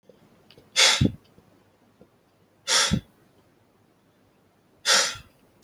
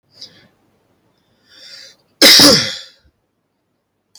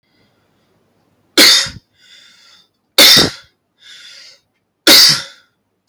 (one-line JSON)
{"exhalation_length": "5.6 s", "exhalation_amplitude": 18802, "exhalation_signal_mean_std_ratio": 0.33, "cough_length": "4.2 s", "cough_amplitude": 32768, "cough_signal_mean_std_ratio": 0.3, "three_cough_length": "5.9 s", "three_cough_amplitude": 32768, "three_cough_signal_mean_std_ratio": 0.36, "survey_phase": "alpha (2021-03-01 to 2021-08-12)", "age": "18-44", "gender": "Male", "wearing_mask": "No", "symptom_none": true, "smoker_status": "Never smoked", "respiratory_condition_asthma": true, "respiratory_condition_other": false, "recruitment_source": "REACT", "submission_delay": "1 day", "covid_test_result": "Negative", "covid_test_method": "RT-qPCR"}